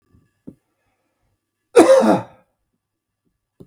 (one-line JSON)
{"cough_length": "3.7 s", "cough_amplitude": 32768, "cough_signal_mean_std_ratio": 0.28, "survey_phase": "beta (2021-08-13 to 2022-03-07)", "age": "45-64", "gender": "Male", "wearing_mask": "No", "symptom_none": true, "smoker_status": "Ex-smoker", "respiratory_condition_asthma": true, "respiratory_condition_other": false, "recruitment_source": "REACT", "submission_delay": "2 days", "covid_test_result": "Negative", "covid_test_method": "RT-qPCR", "influenza_a_test_result": "Negative", "influenza_b_test_result": "Negative"}